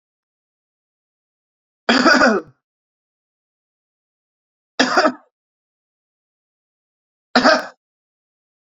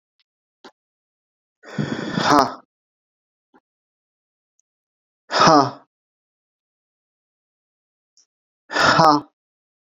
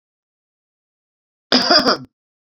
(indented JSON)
{
  "three_cough_length": "8.8 s",
  "three_cough_amplitude": 30085,
  "three_cough_signal_mean_std_ratio": 0.27,
  "exhalation_length": "10.0 s",
  "exhalation_amplitude": 30982,
  "exhalation_signal_mean_std_ratio": 0.28,
  "cough_length": "2.6 s",
  "cough_amplitude": 32767,
  "cough_signal_mean_std_ratio": 0.31,
  "survey_phase": "beta (2021-08-13 to 2022-03-07)",
  "age": "45-64",
  "gender": "Male",
  "wearing_mask": "No",
  "symptom_none": true,
  "symptom_onset": "13 days",
  "smoker_status": "Never smoked",
  "respiratory_condition_asthma": false,
  "respiratory_condition_other": false,
  "recruitment_source": "REACT",
  "submission_delay": "2 days",
  "covid_test_result": "Negative",
  "covid_test_method": "RT-qPCR"
}